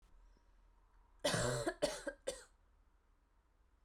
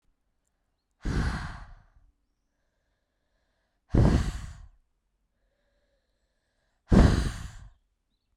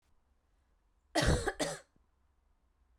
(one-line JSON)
{"three_cough_length": "3.8 s", "three_cough_amplitude": 2920, "three_cough_signal_mean_std_ratio": 0.4, "exhalation_length": "8.4 s", "exhalation_amplitude": 15189, "exhalation_signal_mean_std_ratio": 0.29, "cough_length": "3.0 s", "cough_amplitude": 5114, "cough_signal_mean_std_ratio": 0.33, "survey_phase": "beta (2021-08-13 to 2022-03-07)", "age": "18-44", "gender": "Female", "wearing_mask": "No", "symptom_cough_any": true, "symptom_runny_or_blocked_nose": true, "symptom_fatigue": true, "symptom_headache": true, "smoker_status": "Never smoked", "respiratory_condition_asthma": false, "respiratory_condition_other": false, "recruitment_source": "Test and Trace", "submission_delay": "1 day", "covid_test_result": "Positive", "covid_test_method": "RT-qPCR", "covid_ct_value": 31.6, "covid_ct_gene": "ORF1ab gene", "covid_ct_mean": 32.5, "covid_viral_load": "21 copies/ml", "covid_viral_load_category": "Minimal viral load (< 10K copies/ml)"}